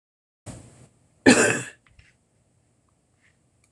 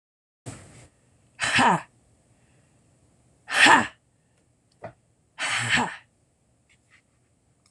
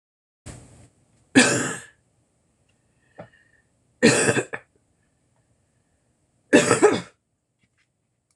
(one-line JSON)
{"cough_length": "3.7 s", "cough_amplitude": 25411, "cough_signal_mean_std_ratio": 0.24, "exhalation_length": "7.7 s", "exhalation_amplitude": 26021, "exhalation_signal_mean_std_ratio": 0.3, "three_cough_length": "8.4 s", "three_cough_amplitude": 25520, "three_cough_signal_mean_std_ratio": 0.29, "survey_phase": "beta (2021-08-13 to 2022-03-07)", "age": "65+", "gender": "Female", "wearing_mask": "No", "symptom_none": true, "smoker_status": "Never smoked", "respiratory_condition_asthma": true, "respiratory_condition_other": false, "recruitment_source": "REACT", "submission_delay": "1 day", "covid_test_result": "Negative", "covid_test_method": "RT-qPCR"}